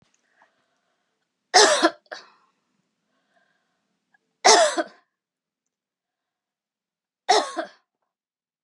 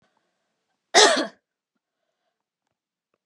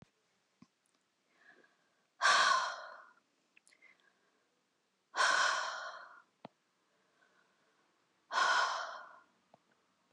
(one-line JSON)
{"three_cough_length": "8.6 s", "three_cough_amplitude": 28776, "three_cough_signal_mean_std_ratio": 0.25, "cough_length": "3.3 s", "cough_amplitude": 30882, "cough_signal_mean_std_ratio": 0.23, "exhalation_length": "10.1 s", "exhalation_amplitude": 4885, "exhalation_signal_mean_std_ratio": 0.35, "survey_phase": "beta (2021-08-13 to 2022-03-07)", "age": "45-64", "gender": "Female", "wearing_mask": "No", "symptom_none": true, "smoker_status": "Never smoked", "respiratory_condition_asthma": true, "respiratory_condition_other": false, "recruitment_source": "REACT", "submission_delay": "1 day", "covid_test_result": "Negative", "covid_test_method": "RT-qPCR", "influenza_a_test_result": "Negative", "influenza_b_test_result": "Negative"}